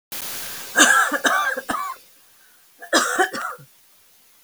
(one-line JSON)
{"cough_length": "4.4 s", "cough_amplitude": 32767, "cough_signal_mean_std_ratio": 0.52, "survey_phase": "beta (2021-08-13 to 2022-03-07)", "age": "65+", "gender": "Female", "wearing_mask": "No", "symptom_none": true, "smoker_status": "Never smoked", "respiratory_condition_asthma": false, "respiratory_condition_other": false, "recruitment_source": "REACT", "submission_delay": "1 day", "covid_test_result": "Negative", "covid_test_method": "RT-qPCR", "influenza_a_test_result": "Negative", "influenza_b_test_result": "Negative"}